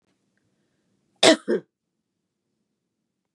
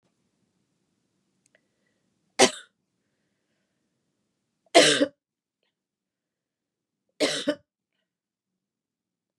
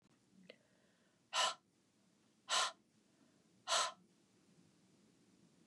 cough_length: 3.3 s
cough_amplitude: 31574
cough_signal_mean_std_ratio: 0.19
three_cough_length: 9.4 s
three_cough_amplitude: 28814
three_cough_signal_mean_std_ratio: 0.19
exhalation_length: 5.7 s
exhalation_amplitude: 2611
exhalation_signal_mean_std_ratio: 0.3
survey_phase: beta (2021-08-13 to 2022-03-07)
age: 45-64
gender: Female
wearing_mask: 'No'
symptom_cough_any: true
symptom_diarrhoea: true
symptom_fatigue: true
symptom_headache: true
symptom_onset: 2 days
smoker_status: Ex-smoker
respiratory_condition_asthma: false
respiratory_condition_other: false
recruitment_source: Test and Trace
submission_delay: 1 day
covid_test_result: Positive
covid_test_method: RT-qPCR
covid_ct_value: 16.9
covid_ct_gene: N gene
covid_ct_mean: 16.9
covid_viral_load: 2800000 copies/ml
covid_viral_load_category: High viral load (>1M copies/ml)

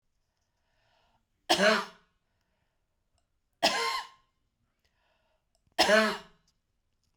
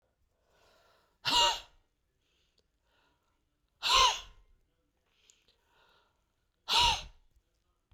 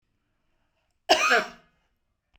three_cough_length: 7.2 s
three_cough_amplitude: 10361
three_cough_signal_mean_std_ratio: 0.3
exhalation_length: 7.9 s
exhalation_amplitude: 8193
exhalation_signal_mean_std_ratio: 0.29
cough_length: 2.4 s
cough_amplitude: 19512
cough_signal_mean_std_ratio: 0.3
survey_phase: beta (2021-08-13 to 2022-03-07)
age: 65+
gender: Female
wearing_mask: 'No'
symptom_none: true
smoker_status: Ex-smoker
respiratory_condition_asthma: false
respiratory_condition_other: true
recruitment_source: REACT
submission_delay: 2 days
covid_test_result: Negative
covid_test_method: RT-qPCR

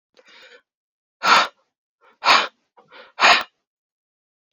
exhalation_length: 4.5 s
exhalation_amplitude: 28648
exhalation_signal_mean_std_ratio: 0.3
survey_phase: alpha (2021-03-01 to 2021-08-12)
age: 18-44
gender: Male
wearing_mask: 'No'
symptom_cough_any: true
symptom_shortness_of_breath: true
symptom_fatigue: true
symptom_headache: true
symptom_loss_of_taste: true
symptom_onset: 4 days
smoker_status: Never smoked
respiratory_condition_asthma: false
respiratory_condition_other: false
recruitment_source: Test and Trace
submission_delay: 2 days
covid_test_result: Positive
covid_test_method: RT-qPCR
covid_ct_value: 13.7
covid_ct_gene: N gene
covid_ct_mean: 14.0
covid_viral_load: 25000000 copies/ml
covid_viral_load_category: High viral load (>1M copies/ml)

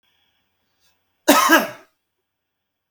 cough_length: 2.9 s
cough_amplitude: 32768
cough_signal_mean_std_ratio: 0.28
survey_phase: beta (2021-08-13 to 2022-03-07)
age: 65+
gender: Male
wearing_mask: 'No'
symptom_none: true
smoker_status: Ex-smoker
respiratory_condition_asthma: true
respiratory_condition_other: false
recruitment_source: REACT
submission_delay: 1 day
covid_test_result: Negative
covid_test_method: RT-qPCR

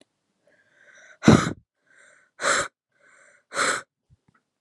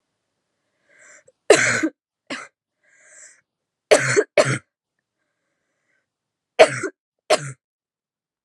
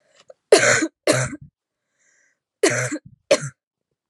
exhalation_length: 4.6 s
exhalation_amplitude: 28389
exhalation_signal_mean_std_ratio: 0.27
three_cough_length: 8.4 s
three_cough_amplitude: 32768
three_cough_signal_mean_std_ratio: 0.27
cough_length: 4.1 s
cough_amplitude: 32767
cough_signal_mean_std_ratio: 0.37
survey_phase: alpha (2021-03-01 to 2021-08-12)
age: 18-44
gender: Female
wearing_mask: 'No'
symptom_cough_any: true
symptom_fatigue: true
symptom_fever_high_temperature: true
symptom_headache: true
symptom_change_to_sense_of_smell_or_taste: true
symptom_loss_of_taste: true
smoker_status: Never smoked
respiratory_condition_asthma: true
respiratory_condition_other: false
recruitment_source: Test and Trace
submission_delay: 2 days
covid_test_result: Positive
covid_test_method: RT-qPCR
covid_ct_value: 12.8
covid_ct_gene: N gene
covid_ct_mean: 12.8
covid_viral_load: 62000000 copies/ml
covid_viral_load_category: High viral load (>1M copies/ml)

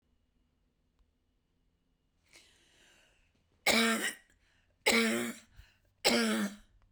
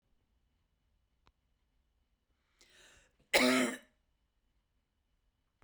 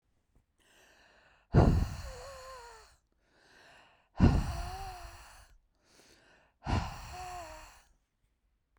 three_cough_length: 6.9 s
three_cough_amplitude: 7762
three_cough_signal_mean_std_ratio: 0.37
cough_length: 5.6 s
cough_amplitude: 8311
cough_signal_mean_std_ratio: 0.22
exhalation_length: 8.8 s
exhalation_amplitude: 10726
exhalation_signal_mean_std_ratio: 0.32
survey_phase: beta (2021-08-13 to 2022-03-07)
age: 45-64
gender: Female
wearing_mask: 'No'
symptom_none: true
smoker_status: Ex-smoker
respiratory_condition_asthma: false
respiratory_condition_other: false
recruitment_source: REACT
submission_delay: 2 days
covid_test_result: Negative
covid_test_method: RT-qPCR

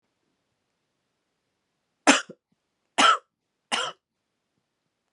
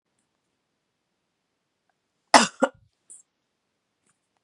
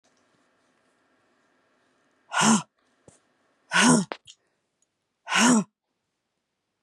three_cough_length: 5.1 s
three_cough_amplitude: 27445
three_cough_signal_mean_std_ratio: 0.22
cough_length: 4.4 s
cough_amplitude: 32768
cough_signal_mean_std_ratio: 0.14
exhalation_length: 6.8 s
exhalation_amplitude: 16672
exhalation_signal_mean_std_ratio: 0.31
survey_phase: beta (2021-08-13 to 2022-03-07)
age: 18-44
gender: Female
wearing_mask: 'No'
symptom_cough_any: true
symptom_runny_or_blocked_nose: true
symptom_sore_throat: true
symptom_fatigue: true
symptom_fever_high_temperature: true
symptom_change_to_sense_of_smell_or_taste: true
symptom_loss_of_taste: true
symptom_other: true
symptom_onset: 5 days
smoker_status: Ex-smoker
respiratory_condition_asthma: false
respiratory_condition_other: false
recruitment_source: Test and Trace
submission_delay: 2 days
covid_test_result: Positive
covid_test_method: RT-qPCR
covid_ct_value: 23.2
covid_ct_gene: ORF1ab gene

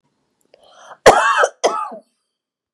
cough_length: 2.7 s
cough_amplitude: 32768
cough_signal_mean_std_ratio: 0.36
survey_phase: beta (2021-08-13 to 2022-03-07)
age: 45-64
gender: Female
wearing_mask: 'No'
symptom_cough_any: true
symptom_fatigue: true
smoker_status: Never smoked
respiratory_condition_asthma: false
respiratory_condition_other: false
recruitment_source: Test and Trace
submission_delay: 2 days
covid_test_result: Positive
covid_test_method: RT-qPCR
covid_ct_value: 16.2
covid_ct_gene: ORF1ab gene
covid_ct_mean: 16.6
covid_viral_load: 3500000 copies/ml
covid_viral_load_category: High viral load (>1M copies/ml)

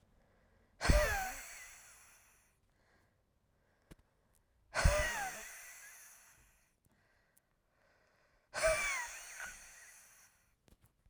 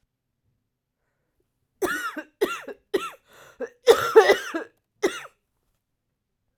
exhalation_length: 11.1 s
exhalation_amplitude: 6173
exhalation_signal_mean_std_ratio: 0.33
cough_length: 6.6 s
cough_amplitude: 27632
cough_signal_mean_std_ratio: 0.29
survey_phase: beta (2021-08-13 to 2022-03-07)
age: 18-44
gender: Female
wearing_mask: 'No'
symptom_cough_any: true
symptom_fatigue: true
symptom_fever_high_temperature: true
symptom_headache: true
smoker_status: Never smoked
respiratory_condition_asthma: false
respiratory_condition_other: false
recruitment_source: Test and Trace
submission_delay: 1 day
covid_test_result: Positive
covid_test_method: RT-qPCR
covid_ct_value: 23.2
covid_ct_gene: ORF1ab gene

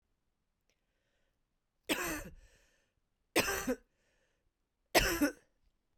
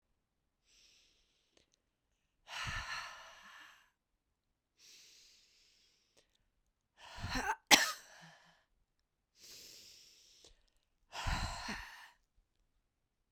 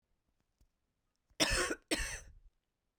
three_cough_length: 6.0 s
three_cough_amplitude: 8346
three_cough_signal_mean_std_ratio: 0.31
exhalation_length: 13.3 s
exhalation_amplitude: 12723
exhalation_signal_mean_std_ratio: 0.25
cough_length: 3.0 s
cough_amplitude: 5503
cough_signal_mean_std_ratio: 0.36
survey_phase: beta (2021-08-13 to 2022-03-07)
age: 45-64
gender: Female
wearing_mask: 'No'
symptom_cough_any: true
symptom_runny_or_blocked_nose: true
symptom_sore_throat: true
symptom_headache: true
symptom_onset: 6 days
smoker_status: Ex-smoker
respiratory_condition_asthma: false
respiratory_condition_other: false
recruitment_source: Test and Trace
submission_delay: 2 days
covid_test_result: Positive
covid_test_method: RT-qPCR
covid_ct_value: 19.5
covid_ct_gene: N gene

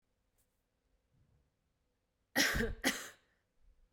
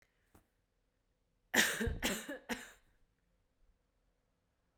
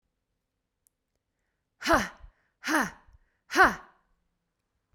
cough_length: 3.9 s
cough_amplitude: 5350
cough_signal_mean_std_ratio: 0.31
three_cough_length: 4.8 s
three_cough_amplitude: 6137
three_cough_signal_mean_std_ratio: 0.31
exhalation_length: 4.9 s
exhalation_amplitude: 15339
exhalation_signal_mean_std_ratio: 0.27
survey_phase: beta (2021-08-13 to 2022-03-07)
age: 18-44
gender: Female
wearing_mask: 'No'
symptom_runny_or_blocked_nose: true
symptom_sore_throat: true
symptom_onset: 4 days
smoker_status: Never smoked
respiratory_condition_asthma: true
respiratory_condition_other: false
recruitment_source: Test and Trace
submission_delay: 1 day
covid_test_result: Negative
covid_test_method: RT-qPCR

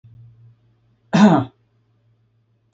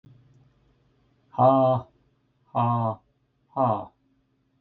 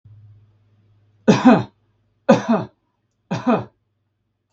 cough_length: 2.7 s
cough_amplitude: 27940
cough_signal_mean_std_ratio: 0.28
exhalation_length: 4.6 s
exhalation_amplitude: 14396
exhalation_signal_mean_std_ratio: 0.4
three_cough_length: 4.5 s
three_cough_amplitude: 32766
three_cough_signal_mean_std_ratio: 0.33
survey_phase: beta (2021-08-13 to 2022-03-07)
age: 45-64
gender: Male
wearing_mask: 'No'
symptom_none: true
smoker_status: Never smoked
respiratory_condition_asthma: true
respiratory_condition_other: false
recruitment_source: REACT
submission_delay: 1 day
covid_test_result: Negative
covid_test_method: RT-qPCR
influenza_a_test_result: Negative
influenza_b_test_result: Negative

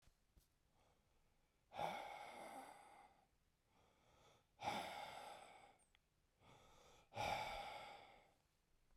exhalation_length: 9.0 s
exhalation_amplitude: 898
exhalation_signal_mean_std_ratio: 0.48
survey_phase: beta (2021-08-13 to 2022-03-07)
age: 18-44
gender: Male
wearing_mask: 'No'
symptom_cough_any: true
symptom_runny_or_blocked_nose: true
symptom_shortness_of_breath: true
symptom_onset: 4 days
smoker_status: Never smoked
respiratory_condition_asthma: false
respiratory_condition_other: false
recruitment_source: Test and Trace
submission_delay: 2 days
covid_test_result: Positive
covid_test_method: RT-qPCR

